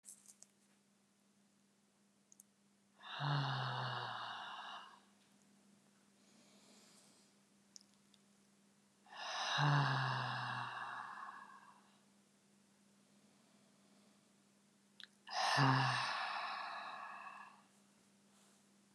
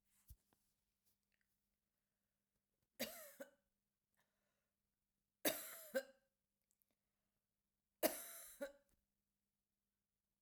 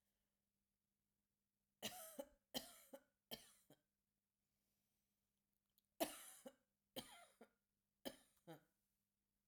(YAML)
exhalation_length: 18.9 s
exhalation_amplitude: 3045
exhalation_signal_mean_std_ratio: 0.44
three_cough_length: 10.4 s
three_cough_amplitude: 2775
three_cough_signal_mean_std_ratio: 0.21
cough_length: 9.5 s
cough_amplitude: 1388
cough_signal_mean_std_ratio: 0.26
survey_phase: alpha (2021-03-01 to 2021-08-12)
age: 45-64
gender: Female
wearing_mask: 'No'
symptom_none: true
smoker_status: Never smoked
respiratory_condition_asthma: false
respiratory_condition_other: false
recruitment_source: REACT
submission_delay: 2 days
covid_test_result: Negative
covid_test_method: RT-qPCR